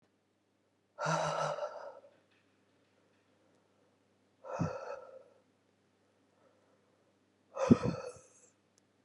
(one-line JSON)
{"exhalation_length": "9.0 s", "exhalation_amplitude": 10058, "exhalation_signal_mean_std_ratio": 0.29, "survey_phase": "beta (2021-08-13 to 2022-03-07)", "age": "45-64", "gender": "Female", "wearing_mask": "No", "symptom_runny_or_blocked_nose": true, "symptom_sore_throat": true, "symptom_fever_high_temperature": true, "symptom_headache": true, "symptom_change_to_sense_of_smell_or_taste": true, "symptom_loss_of_taste": true, "symptom_onset": "3 days", "smoker_status": "Ex-smoker", "respiratory_condition_asthma": false, "respiratory_condition_other": false, "recruitment_source": "Test and Trace", "submission_delay": "2 days", "covid_test_result": "Positive", "covid_test_method": "RT-qPCR", "covid_ct_value": 15.5, "covid_ct_gene": "ORF1ab gene", "covid_ct_mean": 16.0, "covid_viral_load": "5600000 copies/ml", "covid_viral_load_category": "High viral load (>1M copies/ml)"}